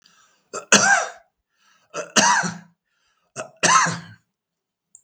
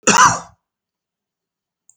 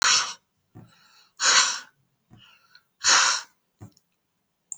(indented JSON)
{
  "three_cough_length": "5.0 s",
  "three_cough_amplitude": 32768,
  "three_cough_signal_mean_std_ratio": 0.38,
  "cough_length": "2.0 s",
  "cough_amplitude": 32768,
  "cough_signal_mean_std_ratio": 0.31,
  "exhalation_length": "4.8 s",
  "exhalation_amplitude": 17862,
  "exhalation_signal_mean_std_ratio": 0.38,
  "survey_phase": "beta (2021-08-13 to 2022-03-07)",
  "age": "18-44",
  "gender": "Male",
  "wearing_mask": "No",
  "symptom_none": true,
  "smoker_status": "Current smoker (11 or more cigarettes per day)",
  "respiratory_condition_asthma": false,
  "respiratory_condition_other": false,
  "recruitment_source": "REACT",
  "submission_delay": "1 day",
  "covid_test_result": "Negative",
  "covid_test_method": "RT-qPCR",
  "influenza_a_test_result": "Negative",
  "influenza_b_test_result": "Negative"
}